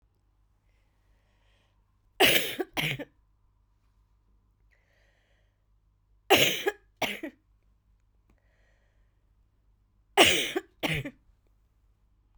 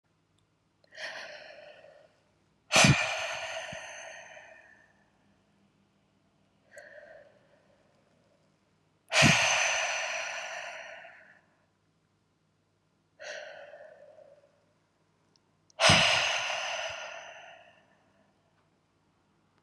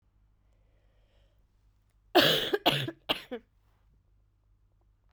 {"three_cough_length": "12.4 s", "three_cough_amplitude": 21416, "three_cough_signal_mean_std_ratio": 0.27, "exhalation_length": "19.6 s", "exhalation_amplitude": 15215, "exhalation_signal_mean_std_ratio": 0.34, "cough_length": "5.1 s", "cough_amplitude": 13901, "cough_signal_mean_std_ratio": 0.29, "survey_phase": "beta (2021-08-13 to 2022-03-07)", "age": "18-44", "gender": "Female", "wearing_mask": "No", "symptom_runny_or_blocked_nose": true, "symptom_headache": true, "symptom_onset": "6 days", "smoker_status": "Never smoked", "respiratory_condition_asthma": false, "respiratory_condition_other": false, "recruitment_source": "Test and Trace", "submission_delay": "1 day", "covid_test_result": "Positive", "covid_test_method": "RT-qPCR", "covid_ct_value": 19.6, "covid_ct_gene": "ORF1ab gene", "covid_ct_mean": 19.8, "covid_viral_load": "330000 copies/ml", "covid_viral_load_category": "Low viral load (10K-1M copies/ml)"}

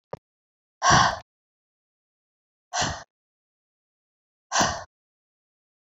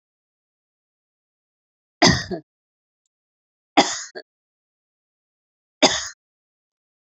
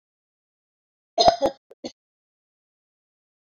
{"exhalation_length": "5.8 s", "exhalation_amplitude": 21643, "exhalation_signal_mean_std_ratio": 0.28, "three_cough_length": "7.2 s", "three_cough_amplitude": 29564, "three_cough_signal_mean_std_ratio": 0.21, "cough_length": "3.5 s", "cough_amplitude": 25999, "cough_signal_mean_std_ratio": 0.21, "survey_phase": "beta (2021-08-13 to 2022-03-07)", "age": "45-64", "gender": "Female", "wearing_mask": "No", "symptom_runny_or_blocked_nose": true, "symptom_sore_throat": true, "symptom_fatigue": true, "symptom_headache": true, "symptom_change_to_sense_of_smell_or_taste": true, "symptom_onset": "4 days", "smoker_status": "Never smoked", "respiratory_condition_asthma": false, "respiratory_condition_other": false, "recruitment_source": "Test and Trace", "submission_delay": "2 days", "covid_test_result": "Positive", "covid_test_method": "RT-qPCR"}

